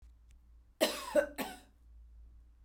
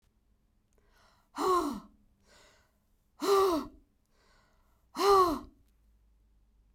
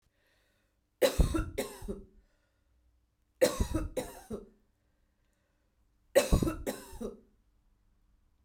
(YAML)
cough_length: 2.6 s
cough_amplitude: 6482
cough_signal_mean_std_ratio: 0.36
exhalation_length: 6.7 s
exhalation_amplitude: 8065
exhalation_signal_mean_std_ratio: 0.35
three_cough_length: 8.4 s
three_cough_amplitude: 8625
three_cough_signal_mean_std_ratio: 0.33
survey_phase: beta (2021-08-13 to 2022-03-07)
age: 45-64
gender: Female
wearing_mask: 'No'
symptom_cough_any: true
symptom_fatigue: true
symptom_fever_high_temperature: true
symptom_headache: true
smoker_status: Never smoked
respiratory_condition_asthma: false
respiratory_condition_other: false
recruitment_source: Test and Trace
submission_delay: 1 day
covid_test_result: Positive
covid_test_method: RT-qPCR